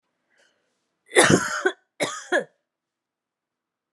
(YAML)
cough_length: 3.9 s
cough_amplitude: 27300
cough_signal_mean_std_ratio: 0.31
survey_phase: beta (2021-08-13 to 2022-03-07)
age: 45-64
gender: Female
wearing_mask: 'No'
symptom_cough_any: true
symptom_runny_or_blocked_nose: true
symptom_shortness_of_breath: true
symptom_fatigue: true
symptom_headache: true
symptom_change_to_sense_of_smell_or_taste: true
symptom_onset: 7 days
smoker_status: Never smoked
respiratory_condition_asthma: false
respiratory_condition_other: false
recruitment_source: Test and Trace
submission_delay: 2 days
covid_test_result: Positive
covid_test_method: RT-qPCR
covid_ct_value: 17.5
covid_ct_gene: ORF1ab gene
covid_ct_mean: 19.1
covid_viral_load: 550000 copies/ml
covid_viral_load_category: Low viral load (10K-1M copies/ml)